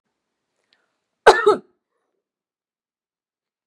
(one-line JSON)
{"cough_length": "3.7 s", "cough_amplitude": 32768, "cough_signal_mean_std_ratio": 0.18, "survey_phase": "beta (2021-08-13 to 2022-03-07)", "age": "45-64", "gender": "Female", "wearing_mask": "No", "symptom_none": true, "symptom_onset": "9 days", "smoker_status": "Never smoked", "respiratory_condition_asthma": true, "respiratory_condition_other": false, "recruitment_source": "REACT", "submission_delay": "3 days", "covid_test_result": "Positive", "covid_test_method": "RT-qPCR", "covid_ct_value": 30.0, "covid_ct_gene": "E gene"}